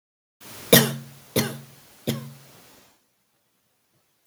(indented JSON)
{
  "three_cough_length": "4.3 s",
  "three_cough_amplitude": 32768,
  "three_cough_signal_mean_std_ratio": 0.25,
  "survey_phase": "beta (2021-08-13 to 2022-03-07)",
  "age": "45-64",
  "gender": "Female",
  "wearing_mask": "No",
  "symptom_none": true,
  "smoker_status": "Current smoker (1 to 10 cigarettes per day)",
  "respiratory_condition_asthma": false,
  "respiratory_condition_other": false,
  "recruitment_source": "REACT",
  "submission_delay": "2 days",
  "covid_test_result": "Negative",
  "covid_test_method": "RT-qPCR",
  "influenza_a_test_result": "Negative",
  "influenza_b_test_result": "Negative"
}